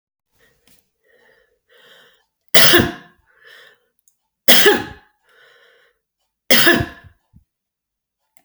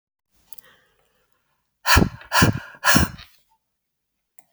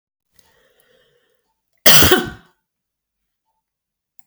{"three_cough_length": "8.4 s", "three_cough_amplitude": 32768, "three_cough_signal_mean_std_ratio": 0.28, "exhalation_length": "4.5 s", "exhalation_amplitude": 29273, "exhalation_signal_mean_std_ratio": 0.31, "cough_length": "4.3 s", "cough_amplitude": 32768, "cough_signal_mean_std_ratio": 0.23, "survey_phase": "beta (2021-08-13 to 2022-03-07)", "age": "65+", "gender": "Female", "wearing_mask": "No", "symptom_none": true, "smoker_status": "Ex-smoker", "respiratory_condition_asthma": true, "respiratory_condition_other": true, "recruitment_source": "REACT", "submission_delay": "0 days", "covid_test_result": "Negative", "covid_test_method": "RT-qPCR"}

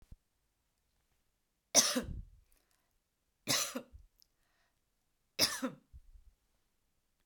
{"three_cough_length": "7.3 s", "three_cough_amplitude": 10889, "three_cough_signal_mean_std_ratio": 0.26, "survey_phase": "beta (2021-08-13 to 2022-03-07)", "age": "45-64", "gender": "Female", "wearing_mask": "No", "symptom_none": true, "symptom_onset": "7 days", "smoker_status": "Ex-smoker", "respiratory_condition_asthma": false, "respiratory_condition_other": false, "recruitment_source": "REACT", "submission_delay": "0 days", "covid_test_result": "Negative", "covid_test_method": "RT-qPCR"}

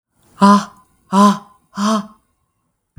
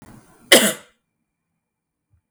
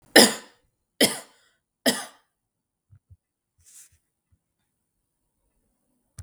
{"exhalation_length": "3.0 s", "exhalation_amplitude": 32766, "exhalation_signal_mean_std_ratio": 0.4, "cough_length": "2.3 s", "cough_amplitude": 32768, "cough_signal_mean_std_ratio": 0.23, "three_cough_length": "6.2 s", "three_cough_amplitude": 32768, "three_cough_signal_mean_std_ratio": 0.18, "survey_phase": "beta (2021-08-13 to 2022-03-07)", "age": "18-44", "gender": "Female", "wearing_mask": "No", "symptom_none": true, "smoker_status": "Ex-smoker", "respiratory_condition_asthma": false, "respiratory_condition_other": false, "recruitment_source": "REACT", "submission_delay": "4 days", "covid_test_result": "Negative", "covid_test_method": "RT-qPCR", "influenza_a_test_result": "Negative", "influenza_b_test_result": "Negative"}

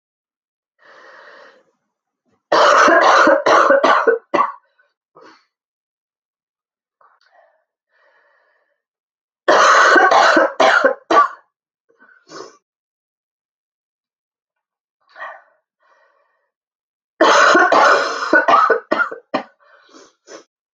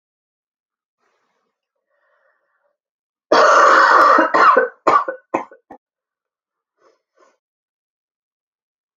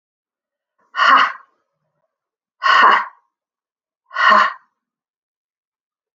{"three_cough_length": "20.7 s", "three_cough_amplitude": 32767, "three_cough_signal_mean_std_ratio": 0.42, "cough_length": "9.0 s", "cough_amplitude": 32767, "cough_signal_mean_std_ratio": 0.35, "exhalation_length": "6.1 s", "exhalation_amplitude": 30013, "exhalation_signal_mean_std_ratio": 0.34, "survey_phase": "beta (2021-08-13 to 2022-03-07)", "age": "18-44", "gender": "Female", "wearing_mask": "No", "symptom_cough_any": true, "symptom_runny_or_blocked_nose": true, "symptom_sore_throat": true, "symptom_fatigue": true, "symptom_headache": true, "symptom_onset": "12 days", "smoker_status": "Never smoked", "respiratory_condition_asthma": false, "respiratory_condition_other": false, "recruitment_source": "REACT", "submission_delay": "2 days", "covid_test_result": "Negative", "covid_test_method": "RT-qPCR"}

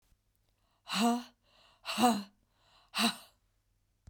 {"exhalation_length": "4.1 s", "exhalation_amplitude": 7175, "exhalation_signal_mean_std_ratio": 0.37, "survey_phase": "beta (2021-08-13 to 2022-03-07)", "age": "45-64", "gender": "Female", "wearing_mask": "No", "symptom_cough_any": true, "symptom_runny_or_blocked_nose": true, "symptom_sore_throat": true, "symptom_fatigue": true, "symptom_fever_high_temperature": true, "symptom_headache": true, "symptom_other": true, "smoker_status": "Never smoked", "respiratory_condition_asthma": false, "respiratory_condition_other": false, "recruitment_source": "Test and Trace", "submission_delay": "2 days", "covid_test_result": "Positive", "covid_test_method": "LFT"}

